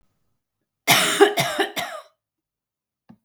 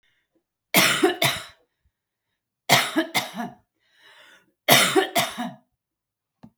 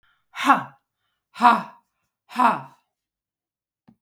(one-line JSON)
{"cough_length": "3.2 s", "cough_amplitude": 32187, "cough_signal_mean_std_ratio": 0.38, "three_cough_length": "6.6 s", "three_cough_amplitude": 31470, "three_cough_signal_mean_std_ratio": 0.39, "exhalation_length": "4.0 s", "exhalation_amplitude": 32746, "exhalation_signal_mean_std_ratio": 0.3, "survey_phase": "beta (2021-08-13 to 2022-03-07)", "age": "65+", "gender": "Female", "wearing_mask": "No", "symptom_none": true, "smoker_status": "Never smoked", "respiratory_condition_asthma": false, "respiratory_condition_other": false, "recruitment_source": "REACT", "submission_delay": "4 days", "covid_test_result": "Negative", "covid_test_method": "RT-qPCR"}